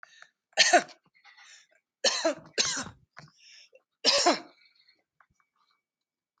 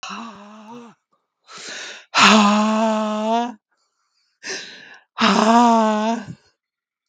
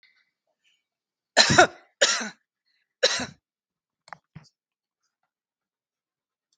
{"three_cough_length": "6.4 s", "three_cough_amplitude": 18716, "three_cough_signal_mean_std_ratio": 0.31, "exhalation_length": "7.1 s", "exhalation_amplitude": 32768, "exhalation_signal_mean_std_ratio": 0.51, "cough_length": "6.6 s", "cough_amplitude": 32552, "cough_signal_mean_std_ratio": 0.23, "survey_phase": "beta (2021-08-13 to 2022-03-07)", "age": "45-64", "gender": "Female", "wearing_mask": "No", "symptom_none": true, "smoker_status": "Ex-smoker", "respiratory_condition_asthma": false, "respiratory_condition_other": false, "recruitment_source": "REACT", "submission_delay": "1 day", "covid_test_result": "Negative", "covid_test_method": "RT-qPCR", "influenza_a_test_result": "Negative", "influenza_b_test_result": "Negative"}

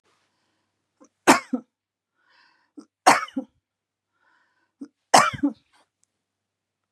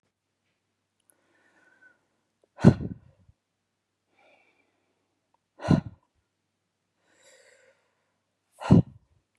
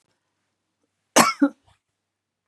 {"three_cough_length": "6.9 s", "three_cough_amplitude": 31256, "three_cough_signal_mean_std_ratio": 0.22, "exhalation_length": "9.4 s", "exhalation_amplitude": 22259, "exhalation_signal_mean_std_ratio": 0.16, "cough_length": "2.5 s", "cough_amplitude": 27693, "cough_signal_mean_std_ratio": 0.23, "survey_phase": "beta (2021-08-13 to 2022-03-07)", "age": "65+", "gender": "Female", "wearing_mask": "No", "symptom_runny_or_blocked_nose": true, "smoker_status": "Ex-smoker", "respiratory_condition_asthma": false, "respiratory_condition_other": false, "recruitment_source": "REACT", "submission_delay": "4 days", "covid_test_result": "Negative", "covid_test_method": "RT-qPCR", "influenza_a_test_result": "Negative", "influenza_b_test_result": "Negative"}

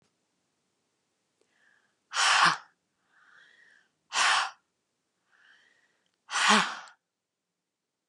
{"exhalation_length": "8.1 s", "exhalation_amplitude": 13978, "exhalation_signal_mean_std_ratio": 0.31, "survey_phase": "beta (2021-08-13 to 2022-03-07)", "age": "45-64", "gender": "Female", "wearing_mask": "No", "symptom_runny_or_blocked_nose": true, "smoker_status": "Never smoked", "respiratory_condition_asthma": true, "respiratory_condition_other": false, "recruitment_source": "REACT", "submission_delay": "1 day", "covid_test_result": "Negative", "covid_test_method": "RT-qPCR", "influenza_a_test_result": "Negative", "influenza_b_test_result": "Negative"}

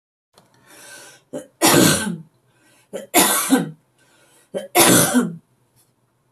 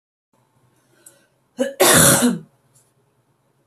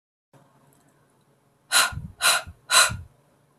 {"three_cough_length": "6.3 s", "three_cough_amplitude": 32768, "three_cough_signal_mean_std_ratio": 0.43, "cough_length": "3.7 s", "cough_amplitude": 32768, "cough_signal_mean_std_ratio": 0.35, "exhalation_length": "3.6 s", "exhalation_amplitude": 24828, "exhalation_signal_mean_std_ratio": 0.34, "survey_phase": "beta (2021-08-13 to 2022-03-07)", "age": "18-44", "gender": "Female", "wearing_mask": "No", "symptom_fatigue": true, "smoker_status": "Never smoked", "respiratory_condition_asthma": false, "respiratory_condition_other": false, "recruitment_source": "Test and Trace", "submission_delay": "1 day", "covid_test_result": "Negative", "covid_test_method": "RT-qPCR"}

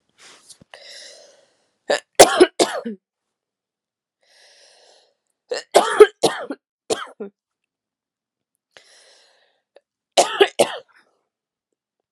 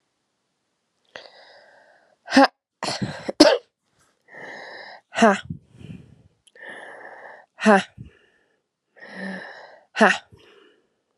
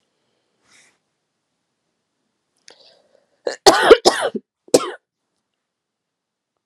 {"three_cough_length": "12.1 s", "three_cough_amplitude": 32768, "three_cough_signal_mean_std_ratio": 0.23, "exhalation_length": "11.2 s", "exhalation_amplitude": 32767, "exhalation_signal_mean_std_ratio": 0.27, "cough_length": "6.7 s", "cough_amplitude": 32768, "cough_signal_mean_std_ratio": 0.21, "survey_phase": "alpha (2021-03-01 to 2021-08-12)", "age": "18-44", "gender": "Female", "wearing_mask": "No", "symptom_cough_any": true, "symptom_shortness_of_breath": true, "symptom_fatigue": true, "symptom_change_to_sense_of_smell_or_taste": true, "symptom_loss_of_taste": true, "symptom_onset": "2 days", "smoker_status": "Never smoked", "respiratory_condition_asthma": true, "respiratory_condition_other": false, "recruitment_source": "Test and Trace", "submission_delay": "2 days", "covid_test_result": "Positive", "covid_test_method": "RT-qPCR"}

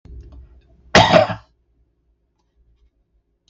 {"cough_length": "3.5 s", "cough_amplitude": 32768, "cough_signal_mean_std_ratio": 0.27, "survey_phase": "beta (2021-08-13 to 2022-03-07)", "age": "65+", "gender": "Male", "wearing_mask": "No", "symptom_none": true, "smoker_status": "Ex-smoker", "respiratory_condition_asthma": false, "respiratory_condition_other": false, "recruitment_source": "REACT", "submission_delay": "8 days", "covid_test_result": "Negative", "covid_test_method": "RT-qPCR"}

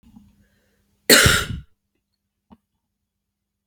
{"cough_length": "3.7 s", "cough_amplitude": 32768, "cough_signal_mean_std_ratio": 0.25, "survey_phase": "beta (2021-08-13 to 2022-03-07)", "age": "18-44", "gender": "Female", "wearing_mask": "No", "symptom_cough_any": true, "symptom_runny_or_blocked_nose": true, "symptom_loss_of_taste": true, "symptom_onset": "3 days", "smoker_status": "Never smoked", "respiratory_condition_asthma": false, "respiratory_condition_other": false, "recruitment_source": "Test and Trace", "submission_delay": "1 day", "covid_test_result": "Positive", "covid_test_method": "RT-qPCR", "covid_ct_value": 15.4, "covid_ct_gene": "ORF1ab gene", "covid_ct_mean": 15.7, "covid_viral_load": "7000000 copies/ml", "covid_viral_load_category": "High viral load (>1M copies/ml)"}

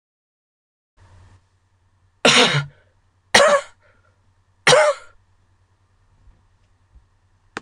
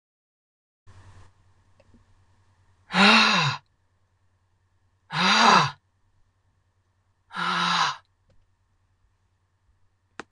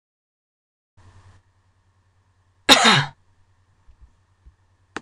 {"three_cough_length": "7.6 s", "three_cough_amplitude": 26028, "three_cough_signal_mean_std_ratio": 0.29, "exhalation_length": "10.3 s", "exhalation_amplitude": 25301, "exhalation_signal_mean_std_ratio": 0.33, "cough_length": "5.0 s", "cough_amplitude": 26028, "cough_signal_mean_std_ratio": 0.22, "survey_phase": "beta (2021-08-13 to 2022-03-07)", "age": "45-64", "gender": "Female", "wearing_mask": "No", "symptom_cough_any": true, "symptom_new_continuous_cough": true, "symptom_runny_or_blocked_nose": true, "symptom_sore_throat": true, "symptom_diarrhoea": true, "symptom_headache": true, "symptom_change_to_sense_of_smell_or_taste": true, "symptom_loss_of_taste": true, "symptom_onset": "4 days", "smoker_status": "Ex-smoker", "respiratory_condition_asthma": false, "respiratory_condition_other": false, "recruitment_source": "Test and Trace", "submission_delay": "2 days", "covid_test_result": "Positive", "covid_test_method": "RT-qPCR", "covid_ct_value": 11.5, "covid_ct_gene": "N gene"}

